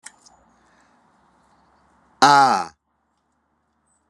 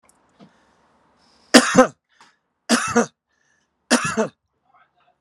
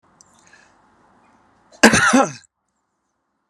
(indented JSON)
{
  "exhalation_length": "4.1 s",
  "exhalation_amplitude": 32767,
  "exhalation_signal_mean_std_ratio": 0.25,
  "three_cough_length": "5.2 s",
  "three_cough_amplitude": 32768,
  "three_cough_signal_mean_std_ratio": 0.29,
  "cough_length": "3.5 s",
  "cough_amplitude": 32768,
  "cough_signal_mean_std_ratio": 0.27,
  "survey_phase": "beta (2021-08-13 to 2022-03-07)",
  "age": "45-64",
  "gender": "Male",
  "wearing_mask": "No",
  "symptom_none": true,
  "smoker_status": "Never smoked",
  "respiratory_condition_asthma": false,
  "respiratory_condition_other": false,
  "recruitment_source": "REACT",
  "submission_delay": "8 days",
  "covid_test_result": "Negative",
  "covid_test_method": "RT-qPCR"
}